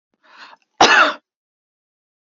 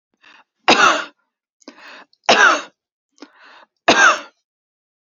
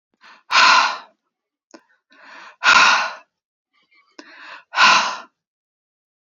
cough_length: 2.2 s
cough_amplitude: 28330
cough_signal_mean_std_ratio: 0.31
three_cough_length: 5.1 s
three_cough_amplitude: 30531
three_cough_signal_mean_std_ratio: 0.35
exhalation_length: 6.2 s
exhalation_amplitude: 31132
exhalation_signal_mean_std_ratio: 0.37
survey_phase: beta (2021-08-13 to 2022-03-07)
age: 45-64
gender: Female
wearing_mask: 'No'
symptom_none: true
smoker_status: Never smoked
respiratory_condition_asthma: false
respiratory_condition_other: false
recruitment_source: REACT
submission_delay: 1 day
covid_test_result: Negative
covid_test_method: RT-qPCR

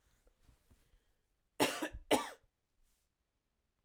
cough_length: 3.8 s
cough_amplitude: 5360
cough_signal_mean_std_ratio: 0.25
survey_phase: alpha (2021-03-01 to 2021-08-12)
age: 18-44
gender: Female
wearing_mask: 'No'
symptom_none: true
smoker_status: Never smoked
respiratory_condition_asthma: false
respiratory_condition_other: false
recruitment_source: REACT
submission_delay: 1 day
covid_test_result: Negative
covid_test_method: RT-qPCR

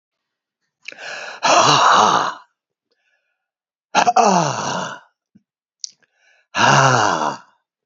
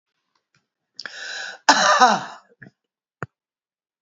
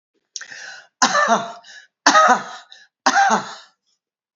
exhalation_length: 7.9 s
exhalation_amplitude: 32768
exhalation_signal_mean_std_ratio: 0.47
cough_length: 4.0 s
cough_amplitude: 30813
cough_signal_mean_std_ratio: 0.31
three_cough_length: 4.4 s
three_cough_amplitude: 32767
three_cough_signal_mean_std_ratio: 0.43
survey_phase: beta (2021-08-13 to 2022-03-07)
age: 65+
gender: Male
wearing_mask: 'No'
symptom_cough_any: true
symptom_sore_throat: true
smoker_status: Ex-smoker
respiratory_condition_asthma: false
respiratory_condition_other: false
recruitment_source: Test and Trace
submission_delay: 1 day
covid_test_result: Positive
covid_test_method: LFT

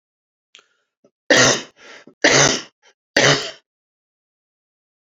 three_cough_length: 5.0 s
three_cough_amplitude: 32767
three_cough_signal_mean_std_ratio: 0.34
survey_phase: alpha (2021-03-01 to 2021-08-12)
age: 45-64
gender: Male
wearing_mask: 'No'
symptom_fatigue: true
symptom_onset: 2 days
smoker_status: Ex-smoker
respiratory_condition_asthma: false
respiratory_condition_other: false
recruitment_source: Test and Trace
submission_delay: 2 days
covid_test_result: Positive
covid_test_method: RT-qPCR
covid_ct_value: 27.8
covid_ct_gene: N gene
covid_ct_mean: 28.3
covid_viral_load: 530 copies/ml
covid_viral_load_category: Minimal viral load (< 10K copies/ml)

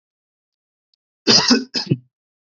cough_length: 2.6 s
cough_amplitude: 31924
cough_signal_mean_std_ratio: 0.33
survey_phase: beta (2021-08-13 to 2022-03-07)
age: 18-44
gender: Male
wearing_mask: 'No'
symptom_none: true
smoker_status: Never smoked
respiratory_condition_asthma: false
respiratory_condition_other: false
recruitment_source: REACT
submission_delay: 1 day
covid_test_result: Negative
covid_test_method: RT-qPCR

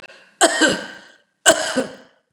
three_cough_length: 2.3 s
three_cough_amplitude: 29204
three_cough_signal_mean_std_ratio: 0.43
survey_phase: beta (2021-08-13 to 2022-03-07)
age: 65+
gender: Female
wearing_mask: 'No'
symptom_abdominal_pain: true
smoker_status: Never smoked
respiratory_condition_asthma: false
respiratory_condition_other: false
recruitment_source: REACT
submission_delay: 3 days
covid_test_result: Negative
covid_test_method: RT-qPCR
influenza_a_test_result: Negative
influenza_b_test_result: Negative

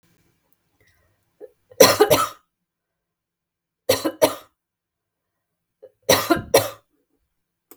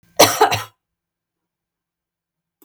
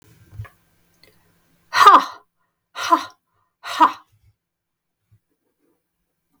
three_cough_length: 7.8 s
three_cough_amplitude: 32768
three_cough_signal_mean_std_ratio: 0.27
cough_length: 2.6 s
cough_amplitude: 32768
cough_signal_mean_std_ratio: 0.26
exhalation_length: 6.4 s
exhalation_amplitude: 32768
exhalation_signal_mean_std_ratio: 0.24
survey_phase: beta (2021-08-13 to 2022-03-07)
age: 45-64
gender: Female
wearing_mask: 'No'
symptom_headache: true
symptom_change_to_sense_of_smell_or_taste: true
symptom_onset: 12 days
smoker_status: Never smoked
respiratory_condition_asthma: false
respiratory_condition_other: false
recruitment_source: REACT
submission_delay: 1 day
covid_test_result: Negative
covid_test_method: RT-qPCR
influenza_a_test_result: Negative
influenza_b_test_result: Negative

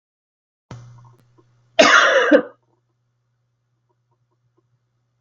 cough_length: 5.2 s
cough_amplitude: 32766
cough_signal_mean_std_ratio: 0.28
survey_phase: beta (2021-08-13 to 2022-03-07)
age: 18-44
gender: Female
wearing_mask: 'No'
symptom_abdominal_pain: true
symptom_onset: 2 days
smoker_status: Never smoked
respiratory_condition_asthma: false
respiratory_condition_other: false
recruitment_source: REACT
submission_delay: 1 day
covid_test_result: Negative
covid_test_method: RT-qPCR
influenza_a_test_result: Negative
influenza_b_test_result: Negative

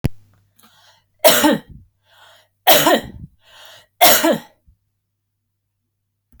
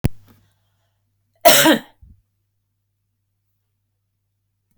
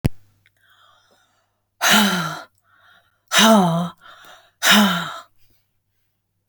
three_cough_length: 6.4 s
three_cough_amplitude: 32768
three_cough_signal_mean_std_ratio: 0.34
cough_length: 4.8 s
cough_amplitude: 32768
cough_signal_mean_std_ratio: 0.23
exhalation_length: 6.5 s
exhalation_amplitude: 31287
exhalation_signal_mean_std_ratio: 0.4
survey_phase: beta (2021-08-13 to 2022-03-07)
age: 45-64
gender: Female
wearing_mask: 'No'
symptom_none: true
smoker_status: Never smoked
respiratory_condition_asthma: false
respiratory_condition_other: false
recruitment_source: REACT
submission_delay: 5 days
covid_test_result: Negative
covid_test_method: RT-qPCR
influenza_a_test_result: Unknown/Void
influenza_b_test_result: Unknown/Void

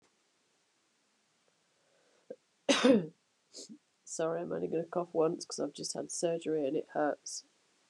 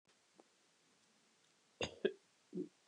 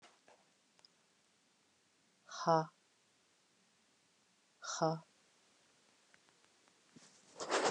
cough_length: 7.9 s
cough_amplitude: 7849
cough_signal_mean_std_ratio: 0.45
three_cough_length: 2.9 s
three_cough_amplitude: 2988
three_cough_signal_mean_std_ratio: 0.25
exhalation_length: 7.7 s
exhalation_amplitude: 9744
exhalation_signal_mean_std_ratio: 0.24
survey_phase: beta (2021-08-13 to 2022-03-07)
age: 45-64
gender: Female
wearing_mask: 'No'
symptom_runny_or_blocked_nose: true
symptom_diarrhoea: true
smoker_status: Current smoker (e-cigarettes or vapes only)
respiratory_condition_asthma: true
respiratory_condition_other: false
recruitment_source: Test and Trace
submission_delay: 2 days
covid_test_result: Positive
covid_test_method: ePCR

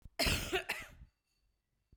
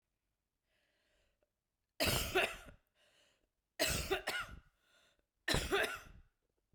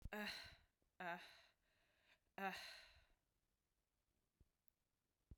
cough_length: 2.0 s
cough_amplitude: 3861
cough_signal_mean_std_ratio: 0.43
three_cough_length: 6.7 s
three_cough_amplitude: 3838
three_cough_signal_mean_std_ratio: 0.39
exhalation_length: 5.4 s
exhalation_amplitude: 578
exhalation_signal_mean_std_ratio: 0.38
survey_phase: beta (2021-08-13 to 2022-03-07)
age: 18-44
gender: Female
wearing_mask: 'No'
symptom_cough_any: true
symptom_runny_or_blocked_nose: true
symptom_sore_throat: true
symptom_fatigue: true
symptom_headache: true
symptom_change_to_sense_of_smell_or_taste: true
symptom_onset: 10 days
smoker_status: Never smoked
respiratory_condition_asthma: false
respiratory_condition_other: false
recruitment_source: Test and Trace
submission_delay: 1 day
covid_test_result: Positive
covid_test_method: RT-qPCR
covid_ct_value: 22.3
covid_ct_gene: ORF1ab gene
covid_ct_mean: 23.2
covid_viral_load: 25000 copies/ml
covid_viral_load_category: Low viral load (10K-1M copies/ml)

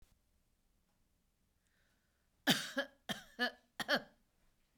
three_cough_length: 4.8 s
three_cough_amplitude: 5090
three_cough_signal_mean_std_ratio: 0.28
survey_phase: beta (2021-08-13 to 2022-03-07)
age: 45-64
gender: Female
wearing_mask: 'No'
symptom_none: true
smoker_status: Ex-smoker
respiratory_condition_asthma: false
respiratory_condition_other: false
recruitment_source: REACT
submission_delay: 1 day
covid_test_result: Negative
covid_test_method: RT-qPCR
influenza_a_test_result: Negative
influenza_b_test_result: Negative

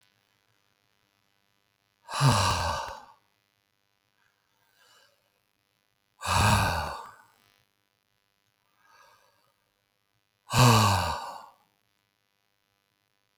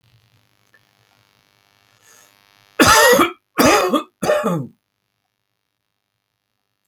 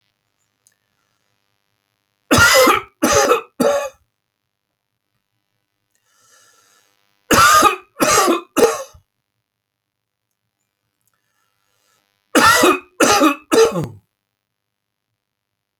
exhalation_length: 13.4 s
exhalation_amplitude: 17048
exhalation_signal_mean_std_ratio: 0.31
cough_length: 6.9 s
cough_amplitude: 32768
cough_signal_mean_std_ratio: 0.35
three_cough_length: 15.8 s
three_cough_amplitude: 32768
three_cough_signal_mean_std_ratio: 0.37
survey_phase: alpha (2021-03-01 to 2021-08-12)
age: 65+
gender: Male
wearing_mask: 'No'
symptom_none: true
smoker_status: Ex-smoker
respiratory_condition_asthma: false
respiratory_condition_other: false
recruitment_source: REACT
submission_delay: 2 days
covid_test_result: Negative
covid_test_method: RT-qPCR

